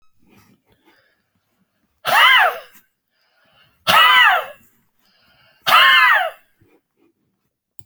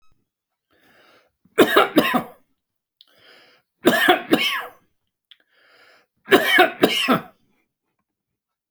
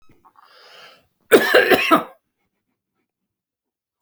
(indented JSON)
{
  "exhalation_length": "7.9 s",
  "exhalation_amplitude": 29702,
  "exhalation_signal_mean_std_ratio": 0.39,
  "three_cough_length": "8.7 s",
  "three_cough_amplitude": 32768,
  "three_cough_signal_mean_std_ratio": 0.36,
  "cough_length": "4.0 s",
  "cough_amplitude": 32767,
  "cough_signal_mean_std_ratio": 0.31,
  "survey_phase": "beta (2021-08-13 to 2022-03-07)",
  "age": "65+",
  "gender": "Male",
  "wearing_mask": "No",
  "symptom_none": true,
  "smoker_status": "Ex-smoker",
  "respiratory_condition_asthma": false,
  "respiratory_condition_other": false,
  "recruitment_source": "REACT",
  "submission_delay": "1 day",
  "covid_test_result": "Negative",
  "covid_test_method": "RT-qPCR"
}